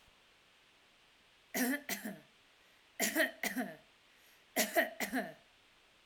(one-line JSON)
{"three_cough_length": "6.1 s", "three_cough_amplitude": 5023, "three_cough_signal_mean_std_ratio": 0.43, "survey_phase": "alpha (2021-03-01 to 2021-08-12)", "age": "45-64", "gender": "Female", "wearing_mask": "No", "symptom_none": true, "smoker_status": "Never smoked", "respiratory_condition_asthma": false, "respiratory_condition_other": false, "recruitment_source": "REACT", "submission_delay": "1 day", "covid_test_result": "Negative", "covid_test_method": "RT-qPCR"}